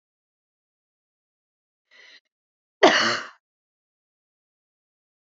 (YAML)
cough_length: 5.2 s
cough_amplitude: 27095
cough_signal_mean_std_ratio: 0.19
survey_phase: beta (2021-08-13 to 2022-03-07)
age: 18-44
gender: Female
wearing_mask: 'No'
symptom_none: true
smoker_status: Never smoked
respiratory_condition_asthma: false
respiratory_condition_other: false
recruitment_source: REACT
submission_delay: 2 days
covid_test_result: Negative
covid_test_method: RT-qPCR
influenza_a_test_result: Negative
influenza_b_test_result: Negative